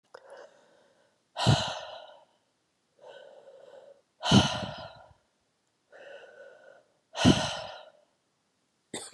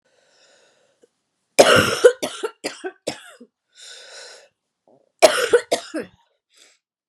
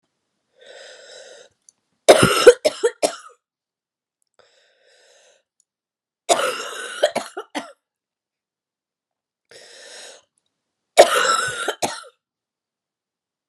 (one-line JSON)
{"exhalation_length": "9.1 s", "exhalation_amplitude": 14253, "exhalation_signal_mean_std_ratio": 0.3, "cough_length": "7.1 s", "cough_amplitude": 32768, "cough_signal_mean_std_ratio": 0.3, "three_cough_length": "13.5 s", "three_cough_amplitude": 32768, "three_cough_signal_mean_std_ratio": 0.26, "survey_phase": "beta (2021-08-13 to 2022-03-07)", "age": "45-64", "gender": "Female", "wearing_mask": "No", "symptom_cough_any": true, "symptom_new_continuous_cough": true, "symptom_runny_or_blocked_nose": true, "symptom_fatigue": true, "symptom_fever_high_temperature": true, "symptom_headache": true, "symptom_change_to_sense_of_smell_or_taste": true, "symptom_loss_of_taste": true, "symptom_other": true, "symptom_onset": "3 days", "smoker_status": "Never smoked", "respiratory_condition_asthma": false, "respiratory_condition_other": false, "recruitment_source": "Test and Trace", "submission_delay": "2 days", "covid_test_result": "Positive", "covid_test_method": "RT-qPCR"}